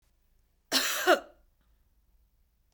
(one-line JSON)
{"cough_length": "2.7 s", "cough_amplitude": 11422, "cough_signal_mean_std_ratio": 0.3, "survey_phase": "beta (2021-08-13 to 2022-03-07)", "age": "45-64", "gender": "Female", "wearing_mask": "No", "symptom_none": true, "smoker_status": "Ex-smoker", "respiratory_condition_asthma": false, "respiratory_condition_other": false, "recruitment_source": "REACT", "submission_delay": "2 days", "covid_test_result": "Negative", "covid_test_method": "RT-qPCR", "influenza_a_test_result": "Negative", "influenza_b_test_result": "Negative"}